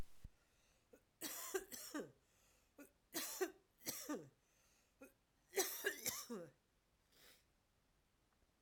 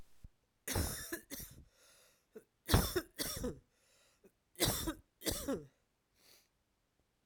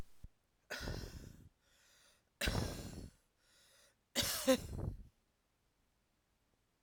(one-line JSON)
{"three_cough_length": "8.6 s", "three_cough_amplitude": 1839, "three_cough_signal_mean_std_ratio": 0.42, "cough_length": "7.3 s", "cough_amplitude": 6008, "cough_signal_mean_std_ratio": 0.38, "exhalation_length": "6.8 s", "exhalation_amplitude": 3876, "exhalation_signal_mean_std_ratio": 0.38, "survey_phase": "alpha (2021-03-01 to 2021-08-12)", "age": "65+", "gender": "Female", "wearing_mask": "No", "symptom_new_continuous_cough": true, "symptom_fatigue": true, "symptom_fever_high_temperature": true, "symptom_headache": true, "symptom_change_to_sense_of_smell_or_taste": true, "symptom_onset": "2 days", "smoker_status": "Never smoked", "respiratory_condition_asthma": false, "respiratory_condition_other": false, "recruitment_source": "Test and Trace", "submission_delay": "1 day", "covid_test_result": "Positive", "covid_test_method": "RT-qPCR", "covid_ct_value": 19.8, "covid_ct_gene": "ORF1ab gene", "covid_ct_mean": 20.4, "covid_viral_load": "200000 copies/ml", "covid_viral_load_category": "Low viral load (10K-1M copies/ml)"}